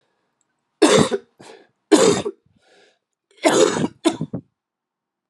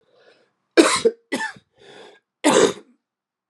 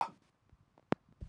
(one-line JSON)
{"three_cough_length": "5.3 s", "three_cough_amplitude": 32090, "three_cough_signal_mean_std_ratio": 0.38, "cough_length": "3.5 s", "cough_amplitude": 32767, "cough_signal_mean_std_ratio": 0.35, "exhalation_length": "1.3 s", "exhalation_amplitude": 8089, "exhalation_signal_mean_std_ratio": 0.2, "survey_phase": "alpha (2021-03-01 to 2021-08-12)", "age": "45-64", "gender": "Male", "wearing_mask": "No", "symptom_cough_any": true, "symptom_shortness_of_breath": true, "symptom_fatigue": true, "symptom_fever_high_temperature": true, "symptom_headache": true, "symptom_change_to_sense_of_smell_or_taste": true, "symptom_onset": "4 days", "smoker_status": "Never smoked", "respiratory_condition_asthma": false, "respiratory_condition_other": false, "recruitment_source": "Test and Trace", "submission_delay": "1 day", "covid_test_result": "Positive", "covid_test_method": "RT-qPCR", "covid_ct_value": 15.7, "covid_ct_gene": "ORF1ab gene", "covid_ct_mean": 16.3, "covid_viral_load": "4500000 copies/ml", "covid_viral_load_category": "High viral load (>1M copies/ml)"}